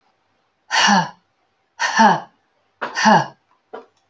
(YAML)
exhalation_length: 4.1 s
exhalation_amplitude: 28141
exhalation_signal_mean_std_ratio: 0.41
survey_phase: alpha (2021-03-01 to 2021-08-12)
age: 45-64
gender: Female
wearing_mask: 'No'
symptom_none: true
smoker_status: Current smoker (1 to 10 cigarettes per day)
respiratory_condition_asthma: false
respiratory_condition_other: false
recruitment_source: REACT
submission_delay: 3 days
covid_test_result: Negative
covid_test_method: RT-qPCR